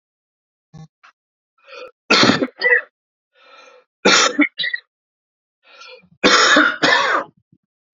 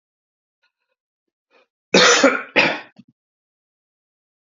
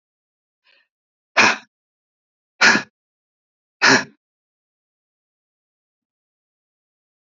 three_cough_length: 7.9 s
three_cough_amplitude: 32768
three_cough_signal_mean_std_ratio: 0.41
cough_length: 4.4 s
cough_amplitude: 32768
cough_signal_mean_std_ratio: 0.3
exhalation_length: 7.3 s
exhalation_amplitude: 30802
exhalation_signal_mean_std_ratio: 0.22
survey_phase: beta (2021-08-13 to 2022-03-07)
age: 18-44
gender: Male
wearing_mask: 'No'
symptom_cough_any: true
symptom_runny_or_blocked_nose: true
symptom_sore_throat: true
symptom_fatigue: true
symptom_headache: true
smoker_status: Never smoked
respiratory_condition_asthma: false
respiratory_condition_other: false
recruitment_source: Test and Trace
submission_delay: 2 days
covid_test_result: Positive
covid_test_method: RT-qPCR
covid_ct_value: 35.5
covid_ct_gene: N gene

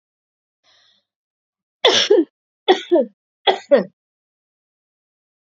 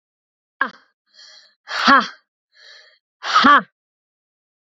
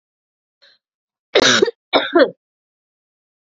three_cough_length: 5.5 s
three_cough_amplitude: 32767
three_cough_signal_mean_std_ratio: 0.3
exhalation_length: 4.7 s
exhalation_amplitude: 32767
exhalation_signal_mean_std_ratio: 0.3
cough_length: 3.5 s
cough_amplitude: 29761
cough_signal_mean_std_ratio: 0.32
survey_phase: alpha (2021-03-01 to 2021-08-12)
age: 18-44
gender: Female
wearing_mask: 'No'
symptom_change_to_sense_of_smell_or_taste: true
symptom_onset: 2 days
smoker_status: Prefer not to say
respiratory_condition_asthma: false
respiratory_condition_other: false
recruitment_source: Test and Trace
submission_delay: 1 day
covid_test_result: Positive
covid_test_method: RT-qPCR
covid_ct_value: 15.1
covid_ct_gene: ORF1ab gene
covid_ct_mean: 15.5
covid_viral_load: 8100000 copies/ml
covid_viral_load_category: High viral load (>1M copies/ml)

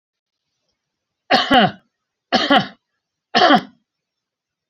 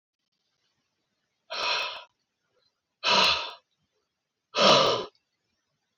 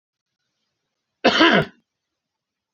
three_cough_length: 4.7 s
three_cough_amplitude: 27719
three_cough_signal_mean_std_ratio: 0.35
exhalation_length: 6.0 s
exhalation_amplitude: 17720
exhalation_signal_mean_std_ratio: 0.35
cough_length: 2.7 s
cough_amplitude: 29741
cough_signal_mean_std_ratio: 0.29
survey_phase: beta (2021-08-13 to 2022-03-07)
age: 65+
gender: Male
wearing_mask: 'No'
symptom_none: true
smoker_status: Never smoked
respiratory_condition_asthma: false
respiratory_condition_other: false
recruitment_source: REACT
submission_delay: 1 day
covid_test_result: Negative
covid_test_method: RT-qPCR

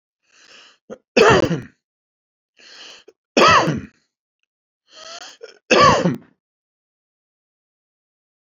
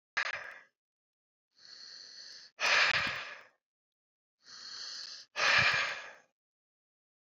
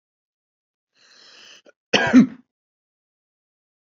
three_cough_length: 8.5 s
three_cough_amplitude: 28986
three_cough_signal_mean_std_ratio: 0.32
exhalation_length: 7.3 s
exhalation_amplitude: 6140
exhalation_signal_mean_std_ratio: 0.4
cough_length: 3.9 s
cough_amplitude: 26184
cough_signal_mean_std_ratio: 0.21
survey_phase: beta (2021-08-13 to 2022-03-07)
age: 45-64
gender: Male
wearing_mask: 'No'
symptom_none: true
smoker_status: Never smoked
respiratory_condition_asthma: true
respiratory_condition_other: false
recruitment_source: REACT
submission_delay: 4 days
covid_test_result: Negative
covid_test_method: RT-qPCR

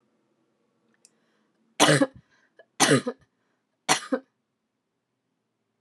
three_cough_length: 5.8 s
three_cough_amplitude: 24531
three_cough_signal_mean_std_ratio: 0.26
survey_phase: alpha (2021-03-01 to 2021-08-12)
age: 18-44
gender: Female
wearing_mask: 'No'
symptom_cough_any: true
symptom_fatigue: true
symptom_headache: true
symptom_onset: 2 days
smoker_status: Never smoked
respiratory_condition_asthma: false
respiratory_condition_other: false
recruitment_source: Test and Trace
submission_delay: 2 days
covid_test_result: Positive
covid_test_method: RT-qPCR
covid_ct_value: 26.8
covid_ct_gene: N gene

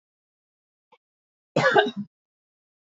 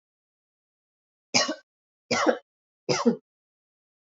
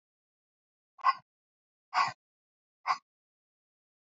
cough_length: 2.8 s
cough_amplitude: 20497
cough_signal_mean_std_ratio: 0.28
three_cough_length: 4.1 s
three_cough_amplitude: 18017
three_cough_signal_mean_std_ratio: 0.3
exhalation_length: 4.2 s
exhalation_amplitude: 6919
exhalation_signal_mean_std_ratio: 0.22
survey_phase: beta (2021-08-13 to 2022-03-07)
age: 18-44
gender: Female
wearing_mask: 'No'
symptom_runny_or_blocked_nose: true
symptom_onset: 13 days
smoker_status: Never smoked
respiratory_condition_asthma: false
respiratory_condition_other: false
recruitment_source: REACT
submission_delay: 1 day
covid_test_result: Negative
covid_test_method: RT-qPCR
influenza_a_test_result: Unknown/Void
influenza_b_test_result: Unknown/Void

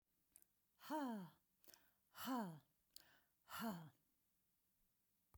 exhalation_length: 5.4 s
exhalation_amplitude: 582
exhalation_signal_mean_std_ratio: 0.42
survey_phase: beta (2021-08-13 to 2022-03-07)
age: 65+
gender: Female
wearing_mask: 'No'
symptom_none: true
smoker_status: Never smoked
respiratory_condition_asthma: false
respiratory_condition_other: false
recruitment_source: REACT
submission_delay: 1 day
covid_test_result: Negative
covid_test_method: RT-qPCR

